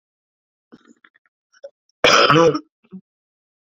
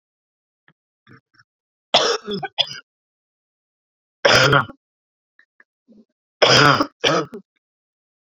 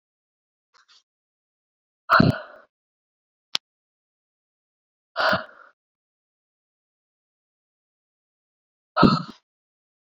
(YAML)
cough_length: 3.8 s
cough_amplitude: 32768
cough_signal_mean_std_ratio: 0.31
three_cough_length: 8.4 s
three_cough_amplitude: 30029
three_cough_signal_mean_std_ratio: 0.32
exhalation_length: 10.2 s
exhalation_amplitude: 32767
exhalation_signal_mean_std_ratio: 0.2
survey_phase: beta (2021-08-13 to 2022-03-07)
age: 45-64
gender: Female
wearing_mask: 'No'
symptom_cough_any: true
symptom_runny_or_blocked_nose: true
symptom_fatigue: true
symptom_headache: true
symptom_onset: 2 days
smoker_status: Ex-smoker
respiratory_condition_asthma: false
respiratory_condition_other: false
recruitment_source: Test and Trace
submission_delay: 2 days
covid_test_result: Positive
covid_test_method: RT-qPCR
covid_ct_value: 11.5
covid_ct_gene: ORF1ab gene
covid_ct_mean: 11.9
covid_viral_load: 130000000 copies/ml
covid_viral_load_category: High viral load (>1M copies/ml)